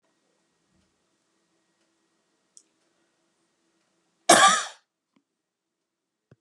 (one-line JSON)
{"cough_length": "6.4 s", "cough_amplitude": 26487, "cough_signal_mean_std_ratio": 0.18, "survey_phase": "beta (2021-08-13 to 2022-03-07)", "age": "65+", "gender": "Female", "wearing_mask": "No", "symptom_none": true, "smoker_status": "Never smoked", "respiratory_condition_asthma": false, "respiratory_condition_other": false, "recruitment_source": "REACT", "submission_delay": "2 days", "covid_test_result": "Negative", "covid_test_method": "RT-qPCR", "influenza_a_test_result": "Negative", "influenza_b_test_result": "Negative"}